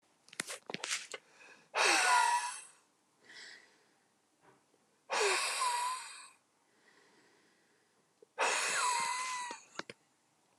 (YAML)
exhalation_length: 10.6 s
exhalation_amplitude: 5755
exhalation_signal_mean_std_ratio: 0.47
survey_phase: alpha (2021-03-01 to 2021-08-12)
age: 45-64
gender: Male
wearing_mask: 'No'
symptom_none: true
symptom_onset: 6 days
smoker_status: Ex-smoker
respiratory_condition_asthma: false
respiratory_condition_other: false
recruitment_source: REACT
submission_delay: 3 days
covid_test_result: Negative
covid_test_method: RT-qPCR